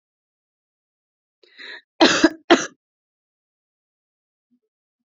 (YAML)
cough_length: 5.1 s
cough_amplitude: 28592
cough_signal_mean_std_ratio: 0.21
survey_phase: beta (2021-08-13 to 2022-03-07)
age: 18-44
gender: Female
wearing_mask: 'No'
symptom_fatigue: true
symptom_headache: true
symptom_onset: 4 days
smoker_status: Current smoker (1 to 10 cigarettes per day)
respiratory_condition_asthma: false
respiratory_condition_other: false
recruitment_source: REACT
submission_delay: 0 days
covid_test_result: Negative
covid_test_method: RT-qPCR
influenza_a_test_result: Negative
influenza_b_test_result: Negative